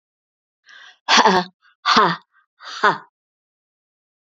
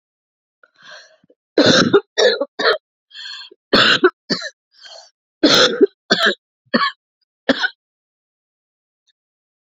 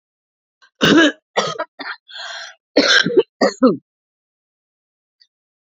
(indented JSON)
{
  "exhalation_length": "4.3 s",
  "exhalation_amplitude": 30795,
  "exhalation_signal_mean_std_ratio": 0.34,
  "three_cough_length": "9.7 s",
  "three_cough_amplitude": 30653,
  "three_cough_signal_mean_std_ratio": 0.38,
  "cough_length": "5.6 s",
  "cough_amplitude": 30371,
  "cough_signal_mean_std_ratio": 0.38,
  "survey_phase": "beta (2021-08-13 to 2022-03-07)",
  "age": "45-64",
  "gender": "Female",
  "wearing_mask": "No",
  "symptom_cough_any": true,
  "symptom_runny_or_blocked_nose": true,
  "symptom_fatigue": true,
  "symptom_headache": true,
  "symptom_onset": "4 days",
  "smoker_status": "Never smoked",
  "respiratory_condition_asthma": false,
  "respiratory_condition_other": false,
  "recruitment_source": "Test and Trace",
  "submission_delay": "1 day",
  "covid_test_result": "Negative",
  "covid_test_method": "RT-qPCR"
}